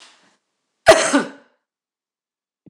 {"cough_length": "2.7 s", "cough_amplitude": 26028, "cough_signal_mean_std_ratio": 0.26, "survey_phase": "beta (2021-08-13 to 2022-03-07)", "age": "65+", "gender": "Female", "wearing_mask": "No", "symptom_none": true, "smoker_status": "Never smoked", "respiratory_condition_asthma": false, "respiratory_condition_other": false, "recruitment_source": "REACT", "submission_delay": "2 days", "covid_test_result": "Negative", "covid_test_method": "RT-qPCR", "influenza_a_test_result": "Negative", "influenza_b_test_result": "Negative"}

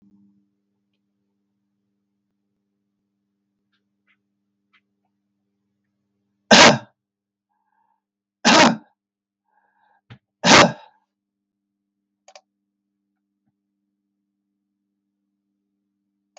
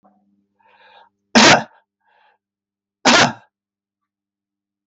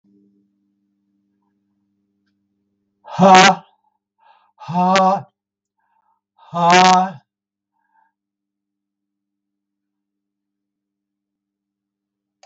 {"three_cough_length": "16.4 s", "three_cough_amplitude": 32768, "three_cough_signal_mean_std_ratio": 0.18, "cough_length": "4.9 s", "cough_amplitude": 32768, "cough_signal_mean_std_ratio": 0.27, "exhalation_length": "12.5 s", "exhalation_amplitude": 32768, "exhalation_signal_mean_std_ratio": 0.27, "survey_phase": "alpha (2021-03-01 to 2021-08-12)", "age": "65+", "gender": "Male", "wearing_mask": "No", "symptom_none": true, "smoker_status": "Ex-smoker", "respiratory_condition_asthma": false, "respiratory_condition_other": false, "recruitment_source": "REACT", "submission_delay": "3 days", "covid_test_result": "Negative", "covid_test_method": "RT-qPCR"}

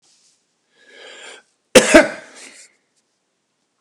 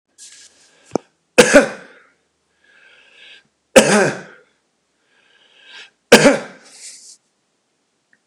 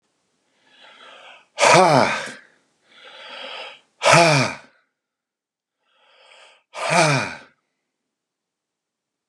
{"cough_length": "3.8 s", "cough_amplitude": 32768, "cough_signal_mean_std_ratio": 0.22, "three_cough_length": "8.3 s", "three_cough_amplitude": 32768, "three_cough_signal_mean_std_ratio": 0.26, "exhalation_length": "9.3 s", "exhalation_amplitude": 31958, "exhalation_signal_mean_std_ratio": 0.34, "survey_phase": "beta (2021-08-13 to 2022-03-07)", "age": "45-64", "gender": "Male", "wearing_mask": "No", "symptom_none": true, "smoker_status": "Ex-smoker", "respiratory_condition_asthma": false, "respiratory_condition_other": false, "recruitment_source": "REACT", "submission_delay": "3 days", "covid_test_result": "Negative", "covid_test_method": "RT-qPCR", "influenza_a_test_result": "Negative", "influenza_b_test_result": "Negative"}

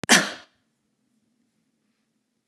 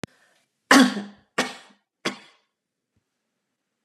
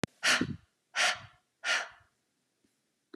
{"cough_length": "2.5 s", "cough_amplitude": 27974, "cough_signal_mean_std_ratio": 0.21, "three_cough_length": "3.8 s", "three_cough_amplitude": 30843, "three_cough_signal_mean_std_ratio": 0.24, "exhalation_length": "3.2 s", "exhalation_amplitude": 9031, "exhalation_signal_mean_std_ratio": 0.38, "survey_phase": "beta (2021-08-13 to 2022-03-07)", "age": "65+", "gender": "Female", "wearing_mask": "No", "symptom_runny_or_blocked_nose": true, "symptom_onset": "13 days", "smoker_status": "Never smoked", "respiratory_condition_asthma": false, "respiratory_condition_other": false, "recruitment_source": "REACT", "submission_delay": "1 day", "covid_test_result": "Negative", "covid_test_method": "RT-qPCR"}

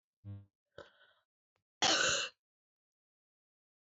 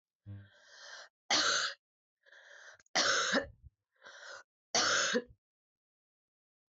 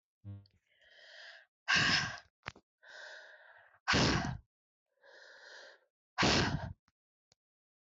{"cough_length": "3.8 s", "cough_amplitude": 3564, "cough_signal_mean_std_ratio": 0.3, "three_cough_length": "6.7 s", "three_cough_amplitude": 3834, "three_cough_signal_mean_std_ratio": 0.42, "exhalation_length": "7.9 s", "exhalation_amplitude": 4204, "exhalation_signal_mean_std_ratio": 0.38, "survey_phase": "beta (2021-08-13 to 2022-03-07)", "age": "45-64", "gender": "Female", "wearing_mask": "No", "symptom_cough_any": true, "symptom_new_continuous_cough": true, "symptom_runny_or_blocked_nose": true, "symptom_shortness_of_breath": true, "symptom_headache": true, "smoker_status": "Never smoked", "respiratory_condition_asthma": false, "respiratory_condition_other": false, "recruitment_source": "Test and Trace", "submission_delay": "1 day", "covid_test_result": "Positive", "covid_test_method": "RT-qPCR"}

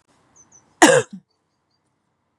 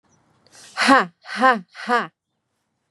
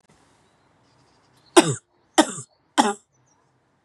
{"cough_length": "2.4 s", "cough_amplitude": 32768, "cough_signal_mean_std_ratio": 0.23, "exhalation_length": "2.9 s", "exhalation_amplitude": 32767, "exhalation_signal_mean_std_ratio": 0.37, "three_cough_length": "3.8 s", "three_cough_amplitude": 32766, "three_cough_signal_mean_std_ratio": 0.23, "survey_phase": "beta (2021-08-13 to 2022-03-07)", "age": "18-44", "gender": "Female", "wearing_mask": "No", "symptom_runny_or_blocked_nose": true, "smoker_status": "Never smoked", "respiratory_condition_asthma": false, "respiratory_condition_other": false, "recruitment_source": "Test and Trace", "submission_delay": "2 days", "covid_test_result": "Positive", "covid_test_method": "LFT"}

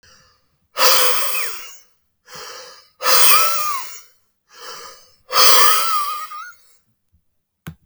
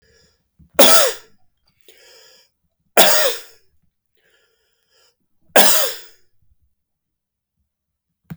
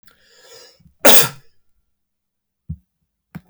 {"exhalation_length": "7.9 s", "exhalation_amplitude": 32768, "exhalation_signal_mean_std_ratio": 0.47, "three_cough_length": "8.4 s", "three_cough_amplitude": 32768, "three_cough_signal_mean_std_ratio": 0.29, "cough_length": "3.5 s", "cough_amplitude": 32768, "cough_signal_mean_std_ratio": 0.22, "survey_phase": "beta (2021-08-13 to 2022-03-07)", "age": "45-64", "gender": "Male", "wearing_mask": "No", "symptom_none": true, "symptom_onset": "8 days", "smoker_status": "Ex-smoker", "respiratory_condition_asthma": false, "respiratory_condition_other": false, "recruitment_source": "REACT", "submission_delay": "7 days", "covid_test_result": "Negative", "covid_test_method": "RT-qPCR"}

